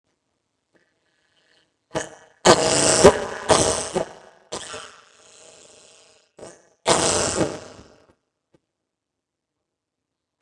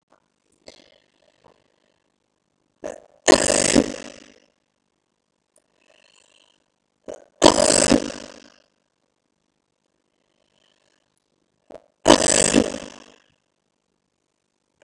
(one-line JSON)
{"cough_length": "10.4 s", "cough_amplitude": 32768, "cough_signal_mean_std_ratio": 0.25, "three_cough_length": "14.8 s", "three_cough_amplitude": 32768, "three_cough_signal_mean_std_ratio": 0.21, "survey_phase": "beta (2021-08-13 to 2022-03-07)", "age": "18-44", "gender": "Female", "wearing_mask": "No", "symptom_runny_or_blocked_nose": true, "smoker_status": "Never smoked", "respiratory_condition_asthma": true, "respiratory_condition_other": false, "recruitment_source": "REACT", "submission_delay": "1 day", "covid_test_result": "Negative", "covid_test_method": "RT-qPCR", "influenza_a_test_result": "Negative", "influenza_b_test_result": "Negative"}